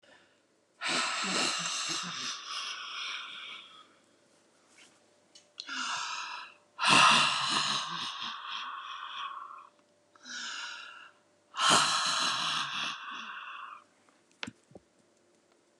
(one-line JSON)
{"exhalation_length": "15.8 s", "exhalation_amplitude": 10602, "exhalation_signal_mean_std_ratio": 0.52, "survey_phase": "beta (2021-08-13 to 2022-03-07)", "age": "65+", "gender": "Female", "wearing_mask": "No", "symptom_none": true, "smoker_status": "Ex-smoker", "respiratory_condition_asthma": false, "respiratory_condition_other": true, "recruitment_source": "REACT", "submission_delay": "1 day", "covid_test_result": "Negative", "covid_test_method": "RT-qPCR", "influenza_a_test_result": "Negative", "influenza_b_test_result": "Negative"}